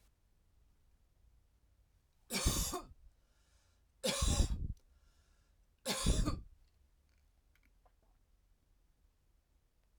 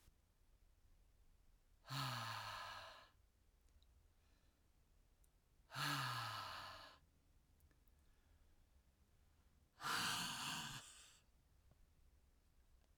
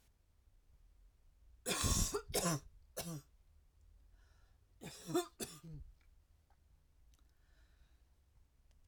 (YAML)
three_cough_length: 10.0 s
three_cough_amplitude: 3864
three_cough_signal_mean_std_ratio: 0.34
exhalation_length: 13.0 s
exhalation_amplitude: 983
exhalation_signal_mean_std_ratio: 0.46
cough_length: 8.9 s
cough_amplitude: 2670
cough_signal_mean_std_ratio: 0.36
survey_phase: alpha (2021-03-01 to 2021-08-12)
age: 45-64
gender: Female
wearing_mask: 'No'
symptom_cough_any: true
symptom_shortness_of_breath: true
symptom_fatigue: true
symptom_headache: true
symptom_onset: 12 days
smoker_status: Ex-smoker
respiratory_condition_asthma: false
respiratory_condition_other: false
recruitment_source: REACT
submission_delay: 1 day
covid_test_result: Negative
covid_test_method: RT-qPCR